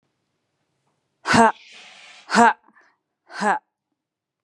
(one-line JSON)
{"exhalation_length": "4.4 s", "exhalation_amplitude": 30184, "exhalation_signal_mean_std_ratio": 0.29, "survey_phase": "beta (2021-08-13 to 2022-03-07)", "age": "18-44", "gender": "Female", "wearing_mask": "No", "symptom_none": true, "smoker_status": "Never smoked", "respiratory_condition_asthma": false, "respiratory_condition_other": false, "recruitment_source": "REACT", "submission_delay": "2 days", "covid_test_result": "Negative", "covid_test_method": "RT-qPCR", "influenza_a_test_result": "Negative", "influenza_b_test_result": "Negative"}